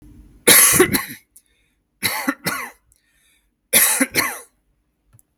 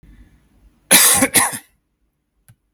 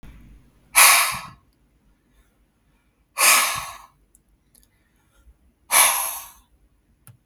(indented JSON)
{
  "three_cough_length": "5.4 s",
  "three_cough_amplitude": 32768,
  "three_cough_signal_mean_std_ratio": 0.4,
  "cough_length": "2.7 s",
  "cough_amplitude": 32768,
  "cough_signal_mean_std_ratio": 0.37,
  "exhalation_length": "7.3 s",
  "exhalation_amplitude": 32768,
  "exhalation_signal_mean_std_ratio": 0.33,
  "survey_phase": "beta (2021-08-13 to 2022-03-07)",
  "age": "18-44",
  "gender": "Male",
  "wearing_mask": "No",
  "symptom_none": true,
  "smoker_status": "Never smoked",
  "respiratory_condition_asthma": false,
  "respiratory_condition_other": false,
  "recruitment_source": "REACT",
  "submission_delay": "2 days",
  "covid_test_result": "Negative",
  "covid_test_method": "RT-qPCR"
}